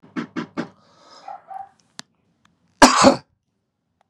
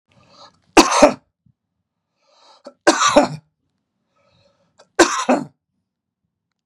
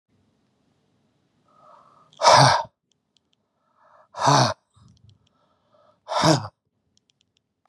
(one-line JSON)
{"cough_length": "4.1 s", "cough_amplitude": 32768, "cough_signal_mean_std_ratio": 0.26, "three_cough_length": "6.7 s", "three_cough_amplitude": 32768, "three_cough_signal_mean_std_ratio": 0.29, "exhalation_length": "7.7 s", "exhalation_amplitude": 30032, "exhalation_signal_mean_std_ratio": 0.29, "survey_phase": "beta (2021-08-13 to 2022-03-07)", "age": "45-64", "gender": "Male", "wearing_mask": "No", "symptom_none": true, "smoker_status": "Ex-smoker", "respiratory_condition_asthma": false, "respiratory_condition_other": false, "recruitment_source": "REACT", "submission_delay": "1 day", "covid_test_result": "Negative", "covid_test_method": "RT-qPCR", "influenza_a_test_result": "Negative", "influenza_b_test_result": "Negative"}